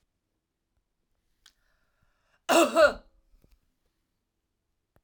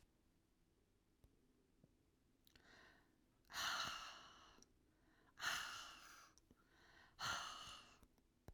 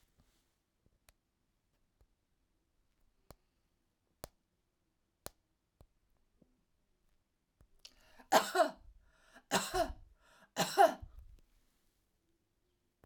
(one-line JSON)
{"cough_length": "5.0 s", "cough_amplitude": 13366, "cough_signal_mean_std_ratio": 0.22, "exhalation_length": "8.5 s", "exhalation_amplitude": 936, "exhalation_signal_mean_std_ratio": 0.43, "three_cough_length": "13.1 s", "three_cough_amplitude": 8075, "three_cough_signal_mean_std_ratio": 0.2, "survey_phase": "alpha (2021-03-01 to 2021-08-12)", "age": "45-64", "gender": "Female", "wearing_mask": "No", "symptom_none": true, "smoker_status": "Never smoked", "respiratory_condition_asthma": false, "respiratory_condition_other": false, "recruitment_source": "REACT", "submission_delay": "2 days", "covid_test_result": "Negative", "covid_test_method": "RT-qPCR"}